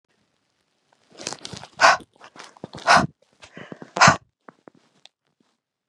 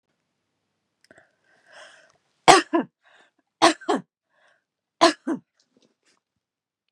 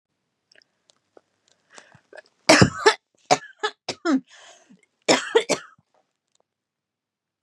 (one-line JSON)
{"exhalation_length": "5.9 s", "exhalation_amplitude": 31654, "exhalation_signal_mean_std_ratio": 0.25, "three_cough_length": "6.9 s", "three_cough_amplitude": 32768, "three_cough_signal_mean_std_ratio": 0.22, "cough_length": "7.4 s", "cough_amplitude": 32179, "cough_signal_mean_std_ratio": 0.26, "survey_phase": "beta (2021-08-13 to 2022-03-07)", "age": "18-44", "gender": "Female", "wearing_mask": "No", "symptom_fatigue": true, "symptom_onset": "13 days", "smoker_status": "Ex-smoker", "respiratory_condition_asthma": true, "respiratory_condition_other": false, "recruitment_source": "REACT", "submission_delay": "0 days", "covid_test_result": "Negative", "covid_test_method": "RT-qPCR", "influenza_a_test_result": "Negative", "influenza_b_test_result": "Negative"}